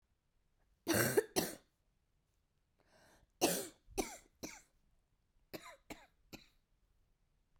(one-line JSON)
{"three_cough_length": "7.6 s", "three_cough_amplitude": 4152, "three_cough_signal_mean_std_ratio": 0.28, "survey_phase": "beta (2021-08-13 to 2022-03-07)", "age": "45-64", "gender": "Female", "wearing_mask": "No", "symptom_cough_any": true, "symptom_runny_or_blocked_nose": true, "symptom_sore_throat": true, "symptom_fatigue": true, "symptom_headache": true, "symptom_onset": "4 days", "smoker_status": "Never smoked", "respiratory_condition_asthma": false, "respiratory_condition_other": false, "recruitment_source": "Test and Trace", "submission_delay": "2 days", "covid_test_result": "Positive", "covid_test_method": "RT-qPCR", "covid_ct_value": 10.7, "covid_ct_gene": "ORF1ab gene"}